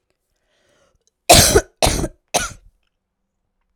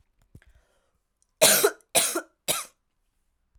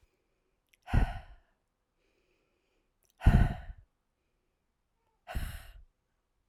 {"cough_length": "3.8 s", "cough_amplitude": 32768, "cough_signal_mean_std_ratio": 0.3, "three_cough_length": "3.6 s", "three_cough_amplitude": 22491, "three_cough_signal_mean_std_ratio": 0.32, "exhalation_length": "6.5 s", "exhalation_amplitude": 11542, "exhalation_signal_mean_std_ratio": 0.24, "survey_phase": "alpha (2021-03-01 to 2021-08-12)", "age": "18-44", "gender": "Female", "wearing_mask": "No", "symptom_cough_any": true, "symptom_shortness_of_breath": true, "symptom_fatigue": true, "symptom_loss_of_taste": true, "smoker_status": "Never smoked", "respiratory_condition_asthma": false, "respiratory_condition_other": false, "recruitment_source": "Test and Trace", "submission_delay": "1 day", "covid_test_result": "Positive", "covid_test_method": "RT-qPCR"}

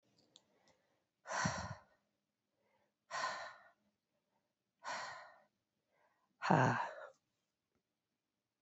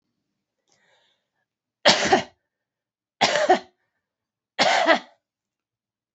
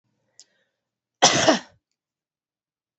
{"exhalation_length": "8.6 s", "exhalation_amplitude": 6435, "exhalation_signal_mean_std_ratio": 0.3, "three_cough_length": "6.1 s", "three_cough_amplitude": 26613, "three_cough_signal_mean_std_ratio": 0.32, "cough_length": "3.0 s", "cough_amplitude": 29599, "cough_signal_mean_std_ratio": 0.25, "survey_phase": "beta (2021-08-13 to 2022-03-07)", "age": "45-64", "gender": "Female", "wearing_mask": "No", "symptom_cough_any": true, "symptom_runny_or_blocked_nose": true, "symptom_fatigue": true, "symptom_other": true, "symptom_onset": "12 days", "smoker_status": "Never smoked", "respiratory_condition_asthma": false, "respiratory_condition_other": false, "recruitment_source": "REACT", "submission_delay": "2 days", "covid_test_result": "Negative", "covid_test_method": "RT-qPCR", "influenza_a_test_result": "Negative", "influenza_b_test_result": "Negative"}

